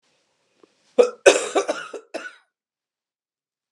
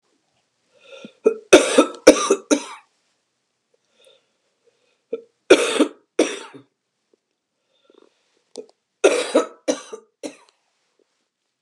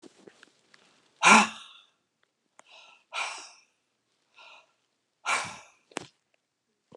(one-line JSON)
{"cough_length": "3.7 s", "cough_amplitude": 32768, "cough_signal_mean_std_ratio": 0.26, "three_cough_length": "11.6 s", "three_cough_amplitude": 32768, "three_cough_signal_mean_std_ratio": 0.27, "exhalation_length": "7.0 s", "exhalation_amplitude": 19559, "exhalation_signal_mean_std_ratio": 0.22, "survey_phase": "beta (2021-08-13 to 2022-03-07)", "age": "65+", "gender": "Female", "wearing_mask": "No", "symptom_cough_any": true, "symptom_runny_or_blocked_nose": true, "symptom_change_to_sense_of_smell_or_taste": true, "symptom_onset": "4 days", "smoker_status": "Ex-smoker", "respiratory_condition_asthma": false, "respiratory_condition_other": false, "recruitment_source": "Test and Trace", "submission_delay": "2 days", "covid_test_result": "Positive", "covid_test_method": "RT-qPCR"}